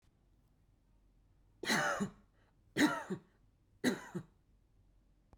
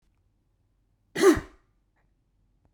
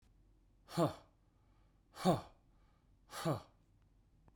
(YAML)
three_cough_length: 5.4 s
three_cough_amplitude: 4143
three_cough_signal_mean_std_ratio: 0.35
cough_length: 2.7 s
cough_amplitude: 13662
cough_signal_mean_std_ratio: 0.23
exhalation_length: 4.4 s
exhalation_amplitude: 3631
exhalation_signal_mean_std_ratio: 0.31
survey_phase: beta (2021-08-13 to 2022-03-07)
age: 18-44
gender: Male
wearing_mask: 'No'
symptom_none: true
smoker_status: Never smoked
respiratory_condition_asthma: false
respiratory_condition_other: false
recruitment_source: Test and Trace
submission_delay: -1 day
covid_test_result: Negative
covid_test_method: LFT